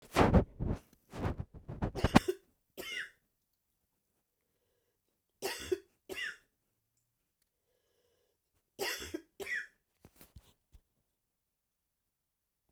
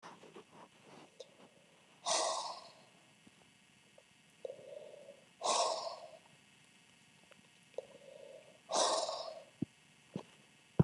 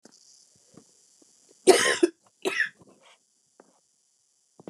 {"three_cough_length": "12.7 s", "three_cough_amplitude": 16143, "three_cough_signal_mean_std_ratio": 0.26, "exhalation_length": "10.8 s", "exhalation_amplitude": 6862, "exhalation_signal_mean_std_ratio": 0.37, "cough_length": "4.7 s", "cough_amplitude": 25174, "cough_signal_mean_std_ratio": 0.25, "survey_phase": "beta (2021-08-13 to 2022-03-07)", "age": "45-64", "gender": "Female", "wearing_mask": "No", "symptom_cough_any": true, "symptom_runny_or_blocked_nose": true, "symptom_sore_throat": true, "symptom_headache": true, "symptom_change_to_sense_of_smell_or_taste": true, "symptom_other": true, "symptom_onset": "2 days", "smoker_status": "Never smoked", "respiratory_condition_asthma": false, "respiratory_condition_other": false, "recruitment_source": "Test and Trace", "submission_delay": "1 day", "covid_test_result": "Positive", "covid_test_method": "RT-qPCR", "covid_ct_value": 17.7, "covid_ct_gene": "N gene"}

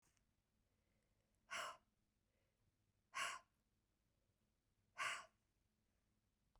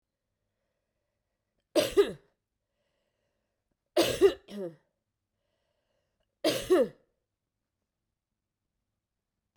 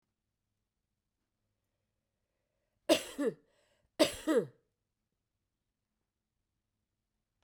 {"exhalation_length": "6.6 s", "exhalation_amplitude": 734, "exhalation_signal_mean_std_ratio": 0.28, "three_cough_length": "9.6 s", "three_cough_amplitude": 10233, "three_cough_signal_mean_std_ratio": 0.25, "cough_length": "7.4 s", "cough_amplitude": 8075, "cough_signal_mean_std_ratio": 0.21, "survey_phase": "beta (2021-08-13 to 2022-03-07)", "age": "65+", "gender": "Female", "wearing_mask": "No", "symptom_none": true, "smoker_status": "Never smoked", "respiratory_condition_asthma": true, "respiratory_condition_other": true, "recruitment_source": "REACT", "submission_delay": "3 days", "covid_test_result": "Negative", "covid_test_method": "RT-qPCR", "influenza_a_test_result": "Negative", "influenza_b_test_result": "Negative"}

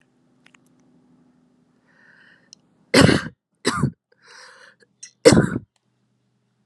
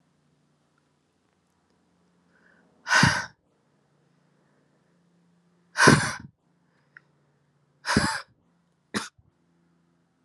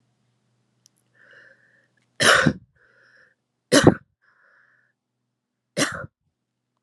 {"cough_length": "6.7 s", "cough_amplitude": 32768, "cough_signal_mean_std_ratio": 0.25, "exhalation_length": "10.2 s", "exhalation_amplitude": 25449, "exhalation_signal_mean_std_ratio": 0.24, "three_cough_length": "6.8 s", "three_cough_amplitude": 32768, "three_cough_signal_mean_std_ratio": 0.23, "survey_phase": "alpha (2021-03-01 to 2021-08-12)", "age": "18-44", "gender": "Female", "wearing_mask": "No", "symptom_shortness_of_breath": true, "symptom_abdominal_pain": true, "symptom_fatigue": true, "symptom_fever_high_temperature": true, "symptom_headache": true, "symptom_change_to_sense_of_smell_or_taste": true, "symptom_onset": "4 days", "smoker_status": "Never smoked", "respiratory_condition_asthma": false, "respiratory_condition_other": false, "recruitment_source": "Test and Trace", "submission_delay": "0 days", "covid_test_result": "Positive", "covid_test_method": "RT-qPCR", "covid_ct_value": 16.2, "covid_ct_gene": "N gene", "covid_ct_mean": 17.6, "covid_viral_load": "1700000 copies/ml", "covid_viral_load_category": "High viral load (>1M copies/ml)"}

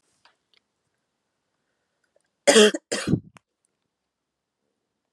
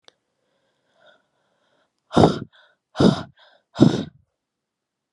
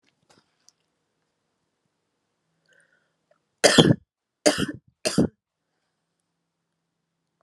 {"cough_length": "5.1 s", "cough_amplitude": 27558, "cough_signal_mean_std_ratio": 0.21, "exhalation_length": "5.1 s", "exhalation_amplitude": 32451, "exhalation_signal_mean_std_ratio": 0.25, "three_cough_length": "7.4 s", "three_cough_amplitude": 32768, "three_cough_signal_mean_std_ratio": 0.21, "survey_phase": "alpha (2021-03-01 to 2021-08-12)", "age": "18-44", "gender": "Female", "wearing_mask": "No", "symptom_cough_any": true, "symptom_abdominal_pain": true, "symptom_fatigue": true, "symptom_fever_high_temperature": true, "symptom_headache": true, "symptom_change_to_sense_of_smell_or_taste": true, "symptom_onset": "4 days", "smoker_status": "Ex-smoker", "respiratory_condition_asthma": false, "respiratory_condition_other": false, "recruitment_source": "Test and Trace", "submission_delay": "2 days", "covid_test_result": "Positive", "covid_test_method": "RT-qPCR", "covid_ct_value": 19.5, "covid_ct_gene": "ORF1ab gene", "covid_ct_mean": 20.2, "covid_viral_load": "250000 copies/ml", "covid_viral_load_category": "Low viral load (10K-1M copies/ml)"}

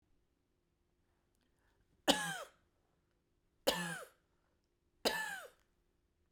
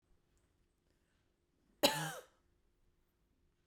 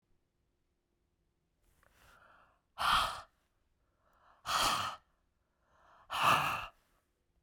{"three_cough_length": "6.3 s", "three_cough_amplitude": 6629, "three_cough_signal_mean_std_ratio": 0.28, "cough_length": "3.7 s", "cough_amplitude": 6010, "cough_signal_mean_std_ratio": 0.2, "exhalation_length": "7.4 s", "exhalation_amplitude": 6618, "exhalation_signal_mean_std_ratio": 0.34, "survey_phase": "beta (2021-08-13 to 2022-03-07)", "age": "45-64", "gender": "Female", "wearing_mask": "No", "symptom_cough_any": true, "symptom_runny_or_blocked_nose": true, "symptom_fatigue": true, "symptom_headache": true, "symptom_change_to_sense_of_smell_or_taste": true, "symptom_onset": "2 days", "smoker_status": "Never smoked", "respiratory_condition_asthma": false, "respiratory_condition_other": false, "recruitment_source": "Test and Trace", "submission_delay": "2 days", "covid_test_result": "Positive", "covid_test_method": "RT-qPCR", "covid_ct_value": 20.4, "covid_ct_gene": "ORF1ab gene"}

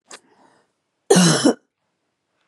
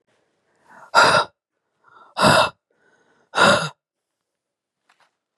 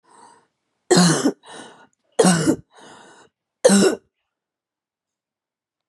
{"cough_length": "2.5 s", "cough_amplitude": 31089, "cough_signal_mean_std_ratio": 0.34, "exhalation_length": "5.4 s", "exhalation_amplitude": 32081, "exhalation_signal_mean_std_ratio": 0.33, "three_cough_length": "5.9 s", "three_cough_amplitude": 27199, "three_cough_signal_mean_std_ratio": 0.36, "survey_phase": "beta (2021-08-13 to 2022-03-07)", "age": "45-64", "gender": "Female", "wearing_mask": "No", "symptom_cough_any": true, "symptom_runny_or_blocked_nose": true, "symptom_shortness_of_breath": true, "symptom_sore_throat": true, "symptom_fatigue": true, "symptom_fever_high_temperature": true, "symptom_onset": "2 days", "smoker_status": "Ex-smoker", "respiratory_condition_asthma": false, "respiratory_condition_other": false, "recruitment_source": "Test and Trace", "submission_delay": "1 day", "covid_test_result": "Positive", "covid_test_method": "RT-qPCR", "covid_ct_value": 17.1, "covid_ct_gene": "ORF1ab gene", "covid_ct_mean": 17.2, "covid_viral_load": "2300000 copies/ml", "covid_viral_load_category": "High viral load (>1M copies/ml)"}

